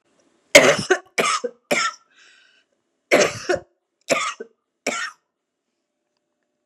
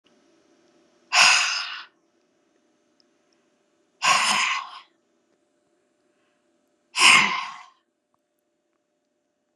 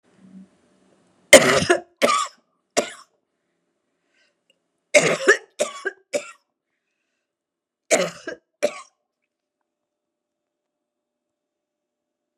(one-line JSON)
{"cough_length": "6.7 s", "cough_amplitude": 32768, "cough_signal_mean_std_ratio": 0.33, "exhalation_length": "9.6 s", "exhalation_amplitude": 27665, "exhalation_signal_mean_std_ratio": 0.31, "three_cough_length": "12.4 s", "three_cough_amplitude": 32768, "three_cough_signal_mean_std_ratio": 0.24, "survey_phase": "beta (2021-08-13 to 2022-03-07)", "age": "45-64", "gender": "Female", "wearing_mask": "No", "symptom_cough_any": true, "symptom_fever_high_temperature": true, "symptom_headache": true, "symptom_onset": "4 days", "smoker_status": "Never smoked", "respiratory_condition_asthma": false, "respiratory_condition_other": false, "recruitment_source": "Test and Trace", "submission_delay": "2 days", "covid_test_result": "Positive", "covid_test_method": "RT-qPCR", "covid_ct_value": 19.9, "covid_ct_gene": "ORF1ab gene", "covid_ct_mean": 20.1, "covid_viral_load": "250000 copies/ml", "covid_viral_load_category": "Low viral load (10K-1M copies/ml)"}